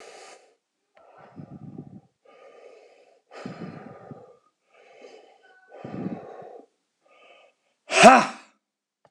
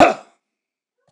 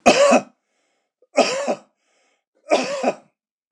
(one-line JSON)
{"exhalation_length": "9.1 s", "exhalation_amplitude": 26028, "exhalation_signal_mean_std_ratio": 0.2, "cough_length": "1.1 s", "cough_amplitude": 26028, "cough_signal_mean_std_ratio": 0.27, "three_cough_length": "3.7 s", "three_cough_amplitude": 26028, "three_cough_signal_mean_std_ratio": 0.41, "survey_phase": "beta (2021-08-13 to 2022-03-07)", "age": "65+", "gender": "Male", "wearing_mask": "No", "symptom_none": true, "smoker_status": "Never smoked", "respiratory_condition_asthma": false, "respiratory_condition_other": false, "recruitment_source": "REACT", "submission_delay": "3 days", "covid_test_result": "Negative", "covid_test_method": "RT-qPCR"}